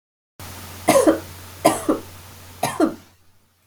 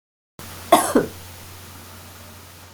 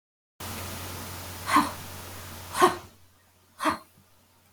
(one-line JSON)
{"three_cough_length": "3.7 s", "three_cough_amplitude": 32768, "three_cough_signal_mean_std_ratio": 0.41, "cough_length": "2.7 s", "cough_amplitude": 32768, "cough_signal_mean_std_ratio": 0.34, "exhalation_length": "4.5 s", "exhalation_amplitude": 16794, "exhalation_signal_mean_std_ratio": 0.41, "survey_phase": "beta (2021-08-13 to 2022-03-07)", "age": "65+", "gender": "Female", "wearing_mask": "No", "symptom_none": true, "symptom_onset": "3 days", "smoker_status": "Never smoked", "respiratory_condition_asthma": false, "respiratory_condition_other": false, "recruitment_source": "REACT", "submission_delay": "2 days", "covid_test_result": "Negative", "covid_test_method": "RT-qPCR", "influenza_a_test_result": "Negative", "influenza_b_test_result": "Negative"}